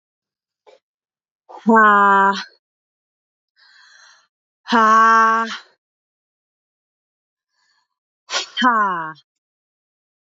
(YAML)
exhalation_length: 10.3 s
exhalation_amplitude: 26061
exhalation_signal_mean_std_ratio: 0.38
survey_phase: beta (2021-08-13 to 2022-03-07)
age: 18-44
gender: Female
wearing_mask: 'No'
symptom_cough_any: true
symptom_sore_throat: true
symptom_change_to_sense_of_smell_or_taste: true
smoker_status: Never smoked
respiratory_condition_asthma: false
respiratory_condition_other: false
recruitment_source: Test and Trace
submission_delay: 1 day
covid_test_result: Positive
covid_test_method: LFT